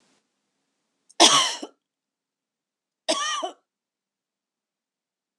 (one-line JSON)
{"cough_length": "5.4 s", "cough_amplitude": 26028, "cough_signal_mean_std_ratio": 0.25, "survey_phase": "beta (2021-08-13 to 2022-03-07)", "age": "65+", "gender": "Female", "wearing_mask": "No", "symptom_runny_or_blocked_nose": true, "symptom_sore_throat": true, "symptom_fatigue": true, "symptom_headache": true, "symptom_other": true, "symptom_onset": "4 days", "smoker_status": "Never smoked", "respiratory_condition_asthma": false, "respiratory_condition_other": false, "recruitment_source": "Test and Trace", "submission_delay": "0 days", "covid_test_result": "Positive", "covid_test_method": "RT-qPCR", "covid_ct_value": 14.3, "covid_ct_gene": "ORF1ab gene", "covid_ct_mean": 14.7, "covid_viral_load": "15000000 copies/ml", "covid_viral_load_category": "High viral load (>1M copies/ml)"}